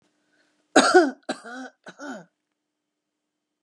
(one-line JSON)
{"three_cough_length": "3.6 s", "three_cough_amplitude": 28660, "three_cough_signal_mean_std_ratio": 0.28, "survey_phase": "beta (2021-08-13 to 2022-03-07)", "age": "45-64", "gender": "Female", "wearing_mask": "No", "symptom_none": true, "smoker_status": "Never smoked", "respiratory_condition_asthma": false, "respiratory_condition_other": false, "recruitment_source": "REACT", "submission_delay": "2 days", "covid_test_result": "Negative", "covid_test_method": "RT-qPCR", "influenza_a_test_result": "Negative", "influenza_b_test_result": "Negative"}